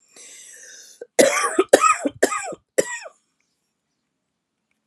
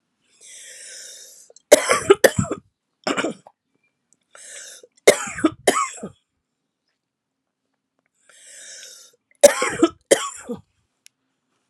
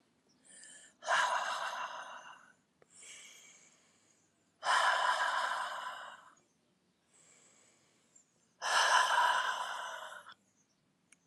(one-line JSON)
{"cough_length": "4.9 s", "cough_amplitude": 32768, "cough_signal_mean_std_ratio": 0.34, "three_cough_length": "11.7 s", "three_cough_amplitude": 32768, "three_cough_signal_mean_std_ratio": 0.26, "exhalation_length": "11.3 s", "exhalation_amplitude": 6400, "exhalation_signal_mean_std_ratio": 0.47, "survey_phase": "alpha (2021-03-01 to 2021-08-12)", "age": "45-64", "gender": "Female", "wearing_mask": "No", "symptom_cough_any": true, "symptom_shortness_of_breath": true, "symptom_fatigue": true, "symptom_fever_high_temperature": true, "symptom_change_to_sense_of_smell_or_taste": true, "symptom_onset": "3 days", "smoker_status": "Ex-smoker", "respiratory_condition_asthma": false, "respiratory_condition_other": false, "recruitment_source": "Test and Trace", "submission_delay": "1 day", "covid_test_result": "Positive", "covid_test_method": "RT-qPCR", "covid_ct_value": 14.7, "covid_ct_gene": "ORF1ab gene", "covid_ct_mean": 14.9, "covid_viral_load": "12000000 copies/ml", "covid_viral_load_category": "High viral load (>1M copies/ml)"}